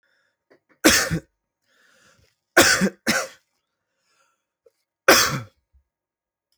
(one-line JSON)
{"three_cough_length": "6.6 s", "three_cough_amplitude": 32768, "three_cough_signal_mean_std_ratio": 0.3, "survey_phase": "alpha (2021-03-01 to 2021-08-12)", "age": "18-44", "gender": "Male", "wearing_mask": "No", "symptom_none": true, "smoker_status": "Never smoked", "respiratory_condition_asthma": true, "respiratory_condition_other": false, "recruitment_source": "REACT", "submission_delay": "1 day", "covid_test_result": "Negative", "covid_test_method": "RT-qPCR"}